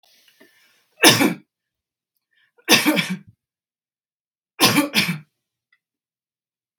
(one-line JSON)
{"three_cough_length": "6.8 s", "three_cough_amplitude": 32768, "three_cough_signal_mean_std_ratio": 0.31, "survey_phase": "beta (2021-08-13 to 2022-03-07)", "age": "18-44", "gender": "Female", "wearing_mask": "No", "symptom_none": true, "symptom_onset": "3 days", "smoker_status": "Never smoked", "respiratory_condition_asthma": false, "respiratory_condition_other": false, "recruitment_source": "REACT", "submission_delay": "1 day", "covid_test_result": "Negative", "covid_test_method": "RT-qPCR", "influenza_a_test_result": "Negative", "influenza_b_test_result": "Negative"}